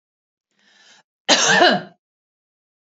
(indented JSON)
{
  "cough_length": "3.0 s",
  "cough_amplitude": 32273,
  "cough_signal_mean_std_ratio": 0.34,
  "survey_phase": "beta (2021-08-13 to 2022-03-07)",
  "age": "45-64",
  "gender": "Female",
  "wearing_mask": "No",
  "symptom_none": true,
  "symptom_onset": "13 days",
  "smoker_status": "Ex-smoker",
  "respiratory_condition_asthma": false,
  "respiratory_condition_other": false,
  "recruitment_source": "REACT",
  "submission_delay": "3 days",
  "covid_test_result": "Negative",
  "covid_test_method": "RT-qPCR",
  "influenza_a_test_result": "Negative",
  "influenza_b_test_result": "Negative"
}